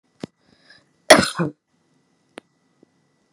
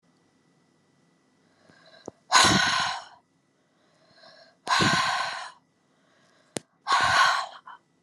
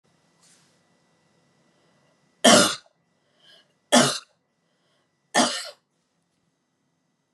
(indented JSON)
{
  "cough_length": "3.3 s",
  "cough_amplitude": 32768,
  "cough_signal_mean_std_ratio": 0.19,
  "exhalation_length": "8.0 s",
  "exhalation_amplitude": 21852,
  "exhalation_signal_mean_std_ratio": 0.41,
  "three_cough_length": "7.3 s",
  "three_cough_amplitude": 30067,
  "three_cough_signal_mean_std_ratio": 0.24,
  "survey_phase": "beta (2021-08-13 to 2022-03-07)",
  "age": "45-64",
  "gender": "Female",
  "wearing_mask": "No",
  "symptom_sore_throat": true,
  "symptom_headache": true,
  "smoker_status": "Never smoked",
  "respiratory_condition_asthma": true,
  "respiratory_condition_other": false,
  "recruitment_source": "REACT",
  "submission_delay": "1 day",
  "covid_test_result": "Negative",
  "covid_test_method": "RT-qPCR"
}